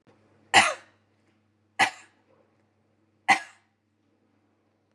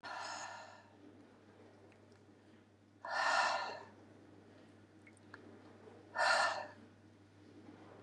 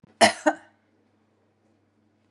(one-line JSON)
{"three_cough_length": "4.9 s", "three_cough_amplitude": 23822, "three_cough_signal_mean_std_ratio": 0.21, "exhalation_length": "8.0 s", "exhalation_amplitude": 3322, "exhalation_signal_mean_std_ratio": 0.43, "cough_length": "2.3 s", "cough_amplitude": 27684, "cough_signal_mean_std_ratio": 0.22, "survey_phase": "beta (2021-08-13 to 2022-03-07)", "age": "65+", "gender": "Female", "wearing_mask": "No", "symptom_none": true, "smoker_status": "Never smoked", "respiratory_condition_asthma": false, "respiratory_condition_other": false, "recruitment_source": "REACT", "submission_delay": "1 day", "covid_test_result": "Negative", "covid_test_method": "RT-qPCR", "influenza_a_test_result": "Negative", "influenza_b_test_result": "Negative"}